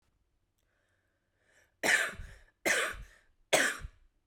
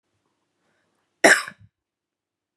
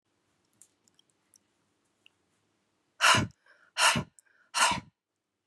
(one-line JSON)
{"three_cough_length": "4.3 s", "three_cough_amplitude": 8198, "three_cough_signal_mean_std_ratio": 0.37, "cough_length": "2.6 s", "cough_amplitude": 31968, "cough_signal_mean_std_ratio": 0.19, "exhalation_length": "5.5 s", "exhalation_amplitude": 11659, "exhalation_signal_mean_std_ratio": 0.28, "survey_phase": "beta (2021-08-13 to 2022-03-07)", "age": "18-44", "gender": "Female", "wearing_mask": "No", "symptom_cough_any": true, "symptom_new_continuous_cough": true, "symptom_runny_or_blocked_nose": true, "symptom_shortness_of_breath": true, "symptom_sore_throat": true, "symptom_abdominal_pain": true, "symptom_diarrhoea": true, "symptom_fatigue": true, "symptom_fever_high_temperature": true, "symptom_headache": true, "symptom_change_to_sense_of_smell_or_taste": true, "symptom_loss_of_taste": true, "symptom_other": true, "symptom_onset": "2 days", "smoker_status": "Never smoked", "respiratory_condition_asthma": true, "respiratory_condition_other": false, "recruitment_source": "Test and Trace", "submission_delay": "1 day", "covid_test_result": "Positive", "covid_test_method": "RT-qPCR", "covid_ct_value": 15.6, "covid_ct_gene": "ORF1ab gene", "covid_ct_mean": 15.9, "covid_viral_load": "6000000 copies/ml", "covid_viral_load_category": "High viral load (>1M copies/ml)"}